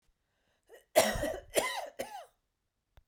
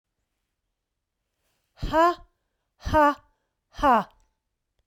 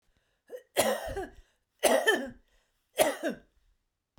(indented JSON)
{
  "cough_length": "3.1 s",
  "cough_amplitude": 9739,
  "cough_signal_mean_std_ratio": 0.37,
  "exhalation_length": "4.9 s",
  "exhalation_amplitude": 12144,
  "exhalation_signal_mean_std_ratio": 0.32,
  "three_cough_length": "4.2 s",
  "three_cough_amplitude": 11688,
  "three_cough_signal_mean_std_ratio": 0.4,
  "survey_phase": "beta (2021-08-13 to 2022-03-07)",
  "age": "45-64",
  "gender": "Female",
  "wearing_mask": "No",
  "symptom_none": true,
  "smoker_status": "Ex-smoker",
  "respiratory_condition_asthma": false,
  "respiratory_condition_other": false,
  "recruitment_source": "REACT",
  "submission_delay": "2 days",
  "covid_test_result": "Negative",
  "covid_test_method": "RT-qPCR",
  "influenza_a_test_result": "Negative",
  "influenza_b_test_result": "Negative"
}